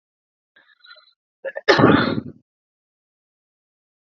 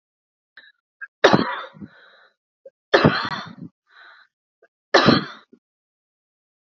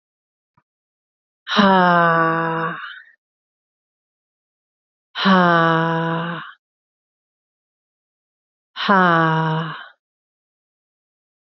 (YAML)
cough_length: 4.0 s
cough_amplitude: 27764
cough_signal_mean_std_ratio: 0.28
three_cough_length: 6.7 s
three_cough_amplitude: 29929
three_cough_signal_mean_std_ratio: 0.29
exhalation_length: 11.4 s
exhalation_amplitude: 31685
exhalation_signal_mean_std_ratio: 0.39
survey_phase: beta (2021-08-13 to 2022-03-07)
age: 45-64
gender: Female
wearing_mask: 'No'
symptom_cough_any: true
symptom_runny_or_blocked_nose: true
symptom_sore_throat: true
symptom_diarrhoea: true
symptom_fatigue: true
symptom_fever_high_temperature: true
symptom_headache: true
symptom_onset: 2 days
smoker_status: Never smoked
respiratory_condition_asthma: false
respiratory_condition_other: false
recruitment_source: Test and Trace
submission_delay: 1 day
covid_test_result: Positive
covid_test_method: RT-qPCR